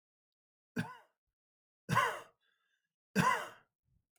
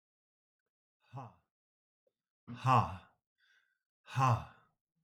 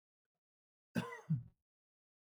{"three_cough_length": "4.2 s", "three_cough_amplitude": 4742, "three_cough_signal_mean_std_ratio": 0.32, "exhalation_length": "5.0 s", "exhalation_amplitude": 5467, "exhalation_signal_mean_std_ratio": 0.28, "cough_length": "2.2 s", "cough_amplitude": 2002, "cough_signal_mean_std_ratio": 0.28, "survey_phase": "beta (2021-08-13 to 2022-03-07)", "age": "45-64", "gender": "Male", "wearing_mask": "No", "symptom_cough_any": true, "symptom_runny_or_blocked_nose": true, "symptom_sore_throat": true, "symptom_headache": true, "symptom_onset": "3 days", "smoker_status": "Ex-smoker", "respiratory_condition_asthma": false, "respiratory_condition_other": false, "recruitment_source": "Test and Trace", "submission_delay": "2 days", "covid_test_result": "Positive", "covid_test_method": "RT-qPCR", "covid_ct_value": 33.5, "covid_ct_gene": "N gene"}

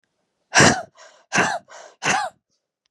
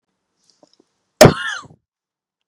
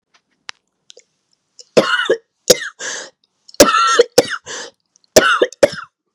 {"exhalation_length": "2.9 s", "exhalation_amplitude": 31611, "exhalation_signal_mean_std_ratio": 0.38, "cough_length": "2.5 s", "cough_amplitude": 32768, "cough_signal_mean_std_ratio": 0.21, "three_cough_length": "6.1 s", "three_cough_amplitude": 32768, "three_cough_signal_mean_std_ratio": 0.37, "survey_phase": "beta (2021-08-13 to 2022-03-07)", "age": "18-44", "gender": "Female", "wearing_mask": "No", "symptom_cough_any": true, "symptom_runny_or_blocked_nose": true, "symptom_onset": "3 days", "smoker_status": "Never smoked", "respiratory_condition_asthma": false, "respiratory_condition_other": false, "recruitment_source": "Test and Trace", "submission_delay": "2 days", "covid_test_result": "Positive", "covid_test_method": "ePCR"}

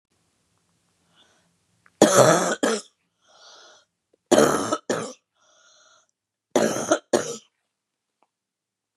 {"three_cough_length": "9.0 s", "three_cough_amplitude": 30476, "three_cough_signal_mean_std_ratio": 0.32, "survey_phase": "beta (2021-08-13 to 2022-03-07)", "age": "65+", "gender": "Female", "wearing_mask": "No", "symptom_headache": true, "smoker_status": "Never smoked", "respiratory_condition_asthma": false, "respiratory_condition_other": false, "recruitment_source": "REACT", "submission_delay": "2 days", "covid_test_result": "Negative", "covid_test_method": "RT-qPCR", "influenza_a_test_result": "Negative", "influenza_b_test_result": "Negative"}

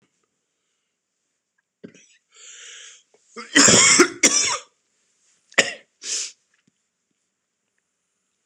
{"cough_length": "8.5 s", "cough_amplitude": 26028, "cough_signal_mean_std_ratio": 0.28, "survey_phase": "beta (2021-08-13 to 2022-03-07)", "age": "45-64", "gender": "Male", "wearing_mask": "No", "symptom_cough_any": true, "symptom_new_continuous_cough": true, "symptom_fatigue": true, "symptom_change_to_sense_of_smell_or_taste": true, "symptom_onset": "5 days", "smoker_status": "Ex-smoker", "respiratory_condition_asthma": false, "respiratory_condition_other": false, "recruitment_source": "Test and Trace", "submission_delay": "1 day", "covid_test_result": "Positive", "covid_test_method": "RT-qPCR", "covid_ct_value": 15.3, "covid_ct_gene": "ORF1ab gene", "covid_ct_mean": 15.5, "covid_viral_load": "8200000 copies/ml", "covid_viral_load_category": "High viral load (>1M copies/ml)"}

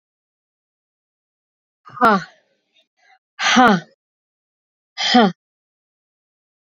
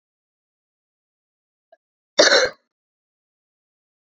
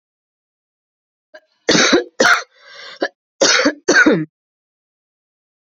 {"exhalation_length": "6.7 s", "exhalation_amplitude": 31882, "exhalation_signal_mean_std_ratio": 0.29, "cough_length": "4.0 s", "cough_amplitude": 28705, "cough_signal_mean_std_ratio": 0.21, "three_cough_length": "5.7 s", "three_cough_amplitude": 31159, "three_cough_signal_mean_std_ratio": 0.39, "survey_phase": "beta (2021-08-13 to 2022-03-07)", "age": "18-44", "gender": "Female", "wearing_mask": "No", "symptom_cough_any": true, "symptom_runny_or_blocked_nose": true, "symptom_shortness_of_breath": true, "symptom_sore_throat": true, "symptom_abdominal_pain": true, "symptom_diarrhoea": true, "symptom_fatigue": true, "symptom_fever_high_temperature": true, "symptom_headache": true, "symptom_change_to_sense_of_smell_or_taste": true, "symptom_loss_of_taste": true, "symptom_onset": "5 days", "smoker_status": "Never smoked", "respiratory_condition_asthma": false, "respiratory_condition_other": false, "recruitment_source": "Test and Trace", "submission_delay": "2 days", "covid_test_result": "Positive", "covid_test_method": "RT-qPCR", "covid_ct_value": 17.8, "covid_ct_gene": "ORF1ab gene", "covid_ct_mean": 18.5, "covid_viral_load": "890000 copies/ml", "covid_viral_load_category": "Low viral load (10K-1M copies/ml)"}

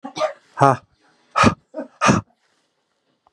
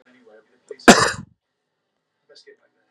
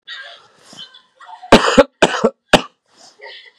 {"exhalation_length": "3.3 s", "exhalation_amplitude": 32767, "exhalation_signal_mean_std_ratio": 0.34, "cough_length": "2.9 s", "cough_amplitude": 32768, "cough_signal_mean_std_ratio": 0.2, "three_cough_length": "3.6 s", "three_cough_amplitude": 32768, "three_cough_signal_mean_std_ratio": 0.31, "survey_phase": "beta (2021-08-13 to 2022-03-07)", "age": "18-44", "gender": "Male", "wearing_mask": "No", "symptom_cough_any": true, "symptom_change_to_sense_of_smell_or_taste": true, "symptom_onset": "12 days", "smoker_status": "Ex-smoker", "respiratory_condition_asthma": false, "respiratory_condition_other": false, "recruitment_source": "REACT", "submission_delay": "1 day", "covid_test_result": "Positive", "covid_test_method": "RT-qPCR", "covid_ct_value": 32.0, "covid_ct_gene": "N gene", "influenza_a_test_result": "Negative", "influenza_b_test_result": "Negative"}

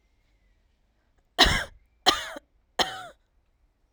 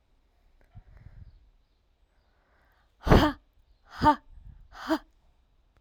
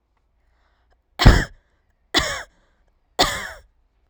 {"cough_length": "3.9 s", "cough_amplitude": 24467, "cough_signal_mean_std_ratio": 0.28, "exhalation_length": "5.8 s", "exhalation_amplitude": 19293, "exhalation_signal_mean_std_ratio": 0.25, "three_cough_length": "4.1 s", "three_cough_amplitude": 32768, "three_cough_signal_mean_std_ratio": 0.27, "survey_phase": "alpha (2021-03-01 to 2021-08-12)", "age": "18-44", "gender": "Female", "wearing_mask": "No", "symptom_none": true, "smoker_status": "Current smoker (1 to 10 cigarettes per day)", "respiratory_condition_asthma": false, "respiratory_condition_other": false, "recruitment_source": "REACT", "submission_delay": "1 day", "covid_test_result": "Negative", "covid_test_method": "RT-qPCR"}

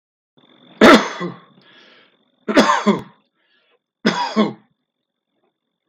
{"three_cough_length": "5.9 s", "three_cough_amplitude": 32768, "three_cough_signal_mean_std_ratio": 0.33, "survey_phase": "beta (2021-08-13 to 2022-03-07)", "age": "45-64", "gender": "Male", "wearing_mask": "No", "symptom_other": true, "smoker_status": "Never smoked", "respiratory_condition_asthma": false, "respiratory_condition_other": false, "recruitment_source": "Test and Trace", "submission_delay": "1 day", "covid_test_result": "Positive", "covid_test_method": "RT-qPCR", "covid_ct_value": 25.4, "covid_ct_gene": "N gene", "covid_ct_mean": 26.0, "covid_viral_load": "2900 copies/ml", "covid_viral_load_category": "Minimal viral load (< 10K copies/ml)"}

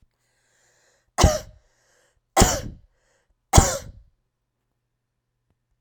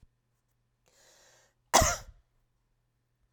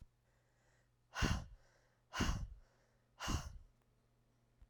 {"three_cough_length": "5.8 s", "three_cough_amplitude": 32767, "three_cough_signal_mean_std_ratio": 0.24, "cough_length": "3.3 s", "cough_amplitude": 15468, "cough_signal_mean_std_ratio": 0.21, "exhalation_length": "4.7 s", "exhalation_amplitude": 2879, "exhalation_signal_mean_std_ratio": 0.37, "survey_phase": "beta (2021-08-13 to 2022-03-07)", "age": "65+", "gender": "Female", "wearing_mask": "No", "symptom_none": true, "smoker_status": "Ex-smoker", "respiratory_condition_asthma": false, "respiratory_condition_other": false, "recruitment_source": "REACT", "submission_delay": "2 days", "covid_test_result": "Negative", "covid_test_method": "RT-qPCR"}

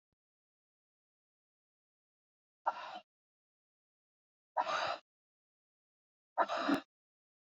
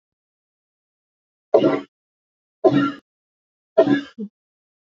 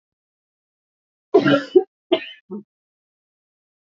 {"exhalation_length": "7.6 s", "exhalation_amplitude": 4604, "exhalation_signal_mean_std_ratio": 0.26, "three_cough_length": "4.9 s", "three_cough_amplitude": 28569, "three_cough_signal_mean_std_ratio": 0.3, "cough_length": "3.9 s", "cough_amplitude": 26323, "cough_signal_mean_std_ratio": 0.26, "survey_phase": "alpha (2021-03-01 to 2021-08-12)", "age": "45-64", "gender": "Female", "wearing_mask": "No", "symptom_cough_any": true, "symptom_new_continuous_cough": true, "symptom_shortness_of_breath": true, "symptom_fatigue": true, "symptom_headache": true, "symptom_onset": "5 days", "smoker_status": "Never smoked", "respiratory_condition_asthma": false, "respiratory_condition_other": false, "recruitment_source": "Test and Trace", "submission_delay": "1 day", "covid_test_result": "Positive", "covid_test_method": "RT-qPCR", "covid_ct_value": 15.3, "covid_ct_gene": "S gene", "covid_ct_mean": 15.6, "covid_viral_load": "7500000 copies/ml", "covid_viral_load_category": "High viral load (>1M copies/ml)"}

